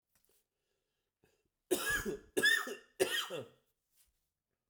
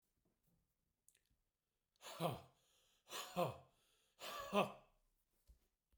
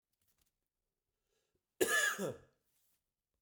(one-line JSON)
{"three_cough_length": "4.7 s", "three_cough_amplitude": 4959, "three_cough_signal_mean_std_ratio": 0.38, "exhalation_length": "6.0 s", "exhalation_amplitude": 2417, "exhalation_signal_mean_std_ratio": 0.3, "cough_length": "3.4 s", "cough_amplitude": 5157, "cough_signal_mean_std_ratio": 0.3, "survey_phase": "beta (2021-08-13 to 2022-03-07)", "age": "45-64", "gender": "Male", "wearing_mask": "No", "symptom_cough_any": true, "symptom_runny_or_blocked_nose": true, "symptom_shortness_of_breath": true, "symptom_sore_throat": true, "symptom_fatigue": true, "symptom_headache": true, "symptom_other": true, "smoker_status": "Ex-smoker", "respiratory_condition_asthma": false, "respiratory_condition_other": false, "recruitment_source": "Test and Trace", "submission_delay": "2 days", "covid_test_result": "Positive", "covid_test_method": "ePCR"}